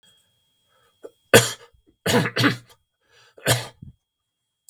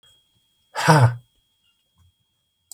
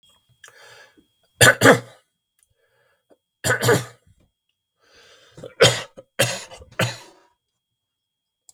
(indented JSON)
{
  "cough_length": "4.7 s",
  "cough_amplitude": 32766,
  "cough_signal_mean_std_ratio": 0.29,
  "exhalation_length": "2.7 s",
  "exhalation_amplitude": 30372,
  "exhalation_signal_mean_std_ratio": 0.29,
  "three_cough_length": "8.5 s",
  "three_cough_amplitude": 32768,
  "three_cough_signal_mean_std_ratio": 0.27,
  "survey_phase": "beta (2021-08-13 to 2022-03-07)",
  "age": "65+",
  "gender": "Male",
  "wearing_mask": "No",
  "symptom_none": true,
  "smoker_status": "Ex-smoker",
  "respiratory_condition_asthma": false,
  "respiratory_condition_other": false,
  "recruitment_source": "REACT",
  "submission_delay": "3 days",
  "covid_test_result": "Negative",
  "covid_test_method": "RT-qPCR",
  "influenza_a_test_result": "Negative",
  "influenza_b_test_result": "Negative"
}